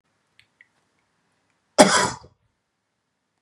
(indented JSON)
{
  "cough_length": "3.4 s",
  "cough_amplitude": 32768,
  "cough_signal_mean_std_ratio": 0.21,
  "survey_phase": "beta (2021-08-13 to 2022-03-07)",
  "age": "18-44",
  "gender": "Male",
  "wearing_mask": "No",
  "symptom_none": true,
  "symptom_onset": "12 days",
  "smoker_status": "Never smoked",
  "respiratory_condition_asthma": false,
  "respiratory_condition_other": true,
  "recruitment_source": "REACT",
  "submission_delay": "1 day",
  "covid_test_result": "Negative",
  "covid_test_method": "RT-qPCR"
}